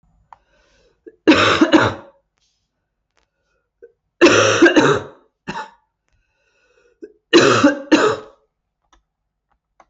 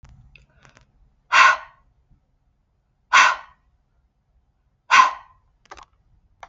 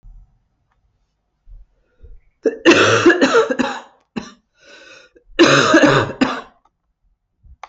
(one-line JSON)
{"three_cough_length": "9.9 s", "three_cough_amplitude": 29620, "three_cough_signal_mean_std_ratio": 0.38, "exhalation_length": "6.5 s", "exhalation_amplitude": 27596, "exhalation_signal_mean_std_ratio": 0.26, "cough_length": "7.7 s", "cough_amplitude": 29675, "cough_signal_mean_std_ratio": 0.42, "survey_phase": "alpha (2021-03-01 to 2021-08-12)", "age": "45-64", "gender": "Female", "wearing_mask": "No", "symptom_cough_any": true, "symptom_change_to_sense_of_smell_or_taste": true, "smoker_status": "Never smoked", "respiratory_condition_asthma": false, "respiratory_condition_other": false, "recruitment_source": "Test and Trace", "submission_delay": "2 days", "covid_test_result": "Positive", "covid_test_method": "RT-qPCR"}